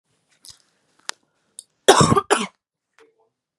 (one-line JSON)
{"cough_length": "3.6 s", "cough_amplitude": 32768, "cough_signal_mean_std_ratio": 0.26, "survey_phase": "beta (2021-08-13 to 2022-03-07)", "age": "18-44", "gender": "Female", "wearing_mask": "No", "symptom_cough_any": true, "symptom_new_continuous_cough": true, "symptom_shortness_of_breath": true, "smoker_status": "Never smoked", "respiratory_condition_asthma": false, "respiratory_condition_other": false, "recruitment_source": "Test and Trace", "submission_delay": "1 day", "covid_test_result": "Positive", "covid_test_method": "RT-qPCR", "covid_ct_value": 25.1, "covid_ct_gene": "N gene"}